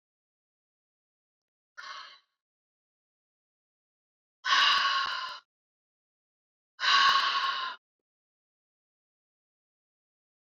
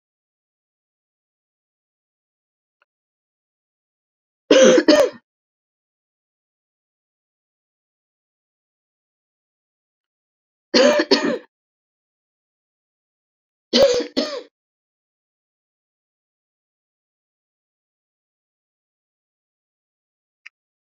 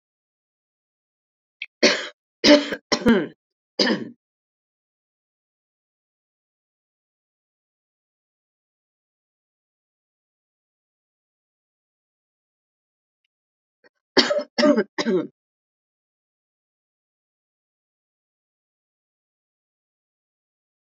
{"exhalation_length": "10.5 s", "exhalation_amplitude": 9157, "exhalation_signal_mean_std_ratio": 0.32, "three_cough_length": "20.8 s", "three_cough_amplitude": 30056, "three_cough_signal_mean_std_ratio": 0.21, "cough_length": "20.8 s", "cough_amplitude": 29668, "cough_signal_mean_std_ratio": 0.2, "survey_phase": "alpha (2021-03-01 to 2021-08-12)", "age": "65+", "gender": "Female", "wearing_mask": "No", "symptom_none": true, "smoker_status": "Never smoked", "respiratory_condition_asthma": false, "respiratory_condition_other": false, "recruitment_source": "REACT", "submission_delay": "1 day", "covid_test_result": "Negative", "covid_test_method": "RT-qPCR"}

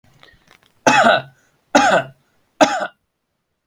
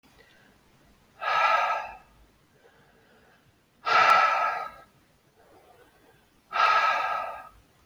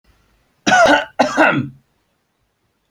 {"three_cough_length": "3.7 s", "three_cough_amplitude": 32767, "three_cough_signal_mean_std_ratio": 0.39, "exhalation_length": "7.9 s", "exhalation_amplitude": 13004, "exhalation_signal_mean_std_ratio": 0.45, "cough_length": "2.9 s", "cough_amplitude": 29280, "cough_signal_mean_std_ratio": 0.43, "survey_phase": "beta (2021-08-13 to 2022-03-07)", "age": "45-64", "gender": "Male", "wearing_mask": "No", "symptom_none": true, "smoker_status": "Never smoked", "respiratory_condition_asthma": false, "respiratory_condition_other": false, "recruitment_source": "REACT", "submission_delay": "2 days", "covid_test_result": "Negative", "covid_test_method": "RT-qPCR"}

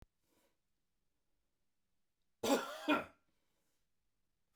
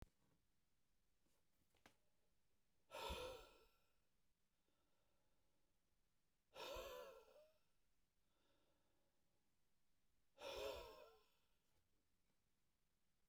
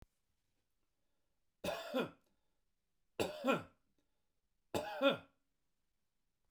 {"cough_length": "4.6 s", "cough_amplitude": 2885, "cough_signal_mean_std_ratio": 0.25, "exhalation_length": "13.3 s", "exhalation_amplitude": 362, "exhalation_signal_mean_std_ratio": 0.39, "three_cough_length": "6.5 s", "three_cough_amplitude": 3100, "three_cough_signal_mean_std_ratio": 0.31, "survey_phase": "beta (2021-08-13 to 2022-03-07)", "age": "45-64", "gender": "Male", "wearing_mask": "No", "symptom_none": true, "smoker_status": "Never smoked", "respiratory_condition_asthma": false, "respiratory_condition_other": false, "recruitment_source": "REACT", "submission_delay": "2 days", "covid_test_result": "Negative", "covid_test_method": "RT-qPCR", "influenza_a_test_result": "Negative", "influenza_b_test_result": "Negative"}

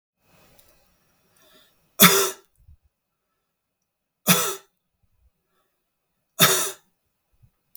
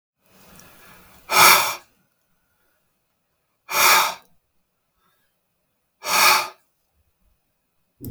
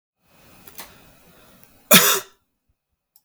{"three_cough_length": "7.8 s", "three_cough_amplitude": 32768, "three_cough_signal_mean_std_ratio": 0.24, "exhalation_length": "8.1 s", "exhalation_amplitude": 32768, "exhalation_signal_mean_std_ratio": 0.31, "cough_length": "3.2 s", "cough_amplitude": 32768, "cough_signal_mean_std_ratio": 0.24, "survey_phase": "beta (2021-08-13 to 2022-03-07)", "age": "45-64", "gender": "Male", "wearing_mask": "No", "symptom_none": true, "smoker_status": "Never smoked", "respiratory_condition_asthma": false, "respiratory_condition_other": false, "recruitment_source": "REACT", "submission_delay": "1 day", "covid_test_result": "Negative", "covid_test_method": "RT-qPCR", "influenza_a_test_result": "Negative", "influenza_b_test_result": "Negative"}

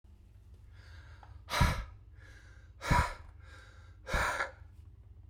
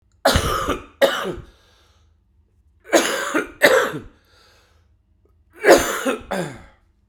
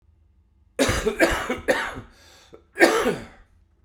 {"exhalation_length": "5.3 s", "exhalation_amplitude": 6644, "exhalation_signal_mean_std_ratio": 0.43, "three_cough_length": "7.1 s", "three_cough_amplitude": 32768, "three_cough_signal_mean_std_ratio": 0.42, "cough_length": "3.8 s", "cough_amplitude": 32767, "cough_signal_mean_std_ratio": 0.47, "survey_phase": "beta (2021-08-13 to 2022-03-07)", "age": "45-64", "gender": "Male", "wearing_mask": "No", "symptom_cough_any": true, "symptom_shortness_of_breath": true, "symptom_loss_of_taste": true, "smoker_status": "Current smoker (1 to 10 cigarettes per day)", "respiratory_condition_asthma": false, "respiratory_condition_other": false, "recruitment_source": "Test and Trace", "submission_delay": "1 day", "covid_test_result": "Positive", "covid_test_method": "LFT"}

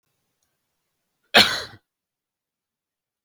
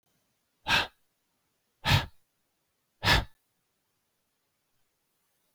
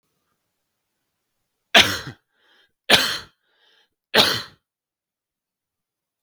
{"cough_length": "3.2 s", "cough_amplitude": 32768, "cough_signal_mean_std_ratio": 0.19, "exhalation_length": "5.5 s", "exhalation_amplitude": 10213, "exhalation_signal_mean_std_ratio": 0.25, "three_cough_length": "6.2 s", "three_cough_amplitude": 32768, "three_cough_signal_mean_std_ratio": 0.24, "survey_phase": "beta (2021-08-13 to 2022-03-07)", "age": "18-44", "gender": "Male", "wearing_mask": "No", "symptom_fatigue": true, "symptom_onset": "12 days", "smoker_status": "Never smoked", "respiratory_condition_asthma": false, "respiratory_condition_other": false, "recruitment_source": "REACT", "submission_delay": "4 days", "covid_test_result": "Negative", "covid_test_method": "RT-qPCR", "influenza_a_test_result": "Negative", "influenza_b_test_result": "Negative"}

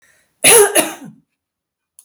{"cough_length": "2.0 s", "cough_amplitude": 32768, "cough_signal_mean_std_ratio": 0.38, "survey_phase": "beta (2021-08-13 to 2022-03-07)", "age": "65+", "gender": "Female", "wearing_mask": "No", "symptom_runny_or_blocked_nose": true, "symptom_sore_throat": true, "smoker_status": "Never smoked", "respiratory_condition_asthma": false, "respiratory_condition_other": false, "recruitment_source": "REACT", "submission_delay": "1 day", "covid_test_result": "Negative", "covid_test_method": "RT-qPCR"}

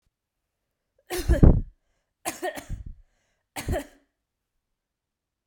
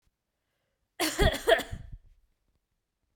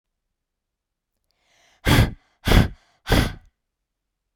{"three_cough_length": "5.5 s", "three_cough_amplitude": 32768, "three_cough_signal_mean_std_ratio": 0.25, "cough_length": "3.2 s", "cough_amplitude": 13738, "cough_signal_mean_std_ratio": 0.31, "exhalation_length": "4.4 s", "exhalation_amplitude": 32294, "exhalation_signal_mean_std_ratio": 0.31, "survey_phase": "beta (2021-08-13 to 2022-03-07)", "age": "18-44", "gender": "Female", "wearing_mask": "No", "symptom_sore_throat": true, "symptom_onset": "6 days", "smoker_status": "Never smoked", "respiratory_condition_asthma": false, "respiratory_condition_other": false, "recruitment_source": "REACT", "submission_delay": "1 day", "covid_test_result": "Negative", "covid_test_method": "RT-qPCR"}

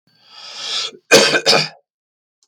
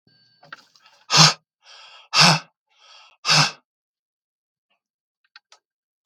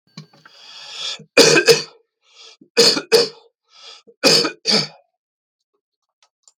{"cough_length": "2.5 s", "cough_amplitude": 32768, "cough_signal_mean_std_ratio": 0.42, "exhalation_length": "6.1 s", "exhalation_amplitude": 32768, "exhalation_signal_mean_std_ratio": 0.27, "three_cough_length": "6.6 s", "three_cough_amplitude": 32768, "three_cough_signal_mean_std_ratio": 0.36, "survey_phase": "beta (2021-08-13 to 2022-03-07)", "age": "45-64", "gender": "Male", "wearing_mask": "No", "symptom_none": true, "smoker_status": "Never smoked", "respiratory_condition_asthma": false, "respiratory_condition_other": true, "recruitment_source": "REACT", "submission_delay": "1 day", "covid_test_result": "Negative", "covid_test_method": "RT-qPCR", "influenza_a_test_result": "Unknown/Void", "influenza_b_test_result": "Unknown/Void"}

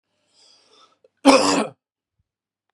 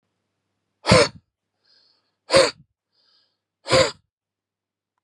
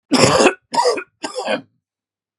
{"cough_length": "2.7 s", "cough_amplitude": 32767, "cough_signal_mean_std_ratio": 0.29, "exhalation_length": "5.0 s", "exhalation_amplitude": 31746, "exhalation_signal_mean_std_ratio": 0.27, "three_cough_length": "2.4 s", "three_cough_amplitude": 32767, "three_cough_signal_mean_std_ratio": 0.5, "survey_phase": "beta (2021-08-13 to 2022-03-07)", "age": "45-64", "gender": "Male", "wearing_mask": "No", "symptom_shortness_of_breath": true, "symptom_sore_throat": true, "symptom_other": true, "smoker_status": "Never smoked", "respiratory_condition_asthma": true, "respiratory_condition_other": false, "recruitment_source": "REACT", "submission_delay": "2 days", "covid_test_result": "Negative", "covid_test_method": "RT-qPCR", "influenza_a_test_result": "Negative", "influenza_b_test_result": "Negative"}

